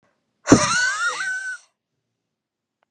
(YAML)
exhalation_length: 2.9 s
exhalation_amplitude: 32768
exhalation_signal_mean_std_ratio: 0.42
survey_phase: beta (2021-08-13 to 2022-03-07)
age: 18-44
gender: Female
wearing_mask: 'No'
symptom_none: true
smoker_status: Never smoked
respiratory_condition_asthma: false
respiratory_condition_other: false
recruitment_source: REACT
submission_delay: 4 days
covid_test_result: Negative
covid_test_method: RT-qPCR
influenza_a_test_result: Negative
influenza_b_test_result: Negative